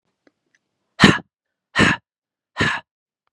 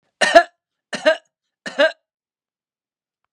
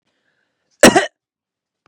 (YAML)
exhalation_length: 3.3 s
exhalation_amplitude: 32768
exhalation_signal_mean_std_ratio: 0.29
three_cough_length: 3.3 s
three_cough_amplitude: 32768
three_cough_signal_mean_std_ratio: 0.27
cough_length: 1.9 s
cough_amplitude: 32768
cough_signal_mean_std_ratio: 0.24
survey_phase: beta (2021-08-13 to 2022-03-07)
age: 18-44
gender: Male
wearing_mask: 'No'
symptom_none: true
symptom_onset: 3 days
smoker_status: Never smoked
respiratory_condition_asthma: false
respiratory_condition_other: false
recruitment_source: Test and Trace
submission_delay: 2 days
covid_test_result: Positive
covid_test_method: RT-qPCR
covid_ct_value: 32.3
covid_ct_gene: N gene